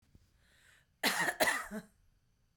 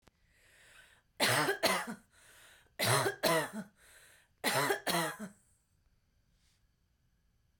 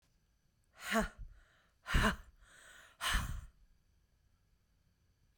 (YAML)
cough_length: 2.6 s
cough_amplitude: 5536
cough_signal_mean_std_ratio: 0.4
three_cough_length: 7.6 s
three_cough_amplitude: 7381
three_cough_signal_mean_std_ratio: 0.43
exhalation_length: 5.4 s
exhalation_amplitude: 4830
exhalation_signal_mean_std_ratio: 0.34
survey_phase: beta (2021-08-13 to 2022-03-07)
age: 18-44
gender: Female
wearing_mask: 'No'
symptom_none: true
smoker_status: Ex-smoker
respiratory_condition_asthma: false
respiratory_condition_other: false
recruitment_source: REACT
submission_delay: 1 day
covid_test_result: Negative
covid_test_method: RT-qPCR
influenza_a_test_result: Negative
influenza_b_test_result: Negative